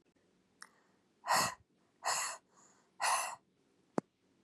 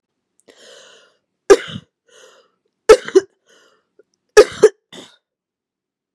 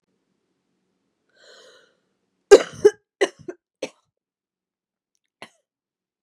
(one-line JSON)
{"exhalation_length": "4.4 s", "exhalation_amplitude": 4944, "exhalation_signal_mean_std_ratio": 0.36, "three_cough_length": "6.1 s", "three_cough_amplitude": 32768, "three_cough_signal_mean_std_ratio": 0.21, "cough_length": "6.2 s", "cough_amplitude": 32768, "cough_signal_mean_std_ratio": 0.14, "survey_phase": "beta (2021-08-13 to 2022-03-07)", "age": "18-44", "gender": "Female", "wearing_mask": "No", "symptom_cough_any": true, "symptom_runny_or_blocked_nose": true, "symptom_sore_throat": true, "symptom_fatigue": true, "symptom_other": true, "symptom_onset": "3 days", "smoker_status": "Never smoked", "respiratory_condition_asthma": false, "respiratory_condition_other": false, "recruitment_source": "Test and Trace", "submission_delay": "2 days", "covid_test_result": "Positive", "covid_test_method": "RT-qPCR", "covid_ct_value": 23.6, "covid_ct_gene": "N gene"}